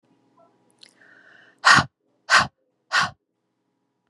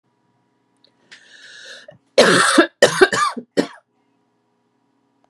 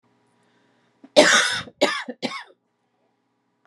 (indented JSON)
{
  "exhalation_length": "4.1 s",
  "exhalation_amplitude": 30498,
  "exhalation_signal_mean_std_ratio": 0.27,
  "three_cough_length": "5.3 s",
  "three_cough_amplitude": 32767,
  "three_cough_signal_mean_std_ratio": 0.34,
  "cough_length": "3.7 s",
  "cough_amplitude": 32767,
  "cough_signal_mean_std_ratio": 0.32,
  "survey_phase": "beta (2021-08-13 to 2022-03-07)",
  "age": "18-44",
  "gender": "Female",
  "wearing_mask": "No",
  "symptom_none": true,
  "smoker_status": "Never smoked",
  "respiratory_condition_asthma": false,
  "respiratory_condition_other": false,
  "recruitment_source": "REACT",
  "submission_delay": "3 days",
  "covid_test_result": "Negative",
  "covid_test_method": "RT-qPCR"
}